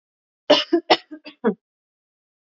three_cough_length: 2.5 s
three_cough_amplitude: 28583
three_cough_signal_mean_std_ratio: 0.29
survey_phase: beta (2021-08-13 to 2022-03-07)
age: 18-44
gender: Female
wearing_mask: 'No'
symptom_change_to_sense_of_smell_or_taste: true
smoker_status: Ex-smoker
respiratory_condition_asthma: false
respiratory_condition_other: false
recruitment_source: REACT
submission_delay: 2 days
covid_test_result: Negative
covid_test_method: RT-qPCR
influenza_a_test_result: Negative
influenza_b_test_result: Negative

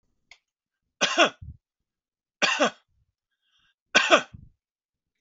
three_cough_length: 5.2 s
three_cough_amplitude: 28560
three_cough_signal_mean_std_ratio: 0.28
survey_phase: beta (2021-08-13 to 2022-03-07)
age: 45-64
gender: Male
wearing_mask: 'No'
symptom_runny_or_blocked_nose: true
symptom_sore_throat: true
symptom_onset: 11 days
smoker_status: Never smoked
respiratory_condition_asthma: false
respiratory_condition_other: false
recruitment_source: REACT
submission_delay: 2 days
covid_test_result: Negative
covid_test_method: RT-qPCR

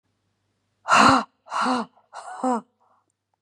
exhalation_length: 3.4 s
exhalation_amplitude: 25621
exhalation_signal_mean_std_ratio: 0.39
survey_phase: beta (2021-08-13 to 2022-03-07)
age: 45-64
gender: Female
wearing_mask: 'No'
symptom_none: true
smoker_status: Never smoked
respiratory_condition_asthma: false
respiratory_condition_other: false
recruitment_source: REACT
submission_delay: 1 day
covid_test_result: Negative
covid_test_method: RT-qPCR
influenza_a_test_result: Unknown/Void
influenza_b_test_result: Unknown/Void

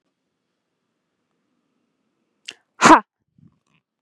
exhalation_length: 4.0 s
exhalation_amplitude: 32767
exhalation_signal_mean_std_ratio: 0.16
survey_phase: beta (2021-08-13 to 2022-03-07)
age: 18-44
gender: Female
wearing_mask: 'No'
symptom_none: true
smoker_status: Never smoked
respiratory_condition_asthma: false
respiratory_condition_other: false
recruitment_source: REACT
submission_delay: 1 day
covid_test_result: Negative
covid_test_method: RT-qPCR
influenza_a_test_result: Negative
influenza_b_test_result: Negative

